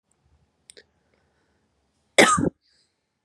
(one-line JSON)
{"cough_length": "3.2 s", "cough_amplitude": 31512, "cough_signal_mean_std_ratio": 0.23, "survey_phase": "beta (2021-08-13 to 2022-03-07)", "age": "18-44", "gender": "Female", "wearing_mask": "No", "symptom_runny_or_blocked_nose": true, "symptom_sore_throat": true, "smoker_status": "Never smoked", "respiratory_condition_asthma": false, "respiratory_condition_other": false, "recruitment_source": "Test and Trace", "submission_delay": "2 days", "covid_test_result": "Positive", "covid_test_method": "RT-qPCR", "covid_ct_value": 28.1, "covid_ct_gene": "ORF1ab gene", "covid_ct_mean": 28.3, "covid_viral_load": "540 copies/ml", "covid_viral_load_category": "Minimal viral load (< 10K copies/ml)"}